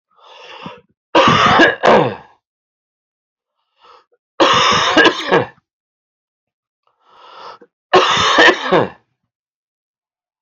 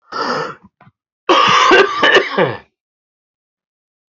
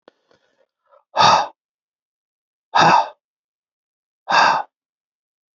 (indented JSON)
{
  "three_cough_length": "10.4 s",
  "three_cough_amplitude": 32767,
  "three_cough_signal_mean_std_ratio": 0.43,
  "cough_length": "4.1 s",
  "cough_amplitude": 29806,
  "cough_signal_mean_std_ratio": 0.49,
  "exhalation_length": "5.5 s",
  "exhalation_amplitude": 27585,
  "exhalation_signal_mean_std_ratio": 0.33,
  "survey_phase": "alpha (2021-03-01 to 2021-08-12)",
  "age": "45-64",
  "gender": "Male",
  "wearing_mask": "No",
  "symptom_none": true,
  "smoker_status": "Ex-smoker",
  "respiratory_condition_asthma": false,
  "respiratory_condition_other": false,
  "recruitment_source": "REACT",
  "submission_delay": "1 day",
  "covid_test_result": "Negative",
  "covid_test_method": "RT-qPCR"
}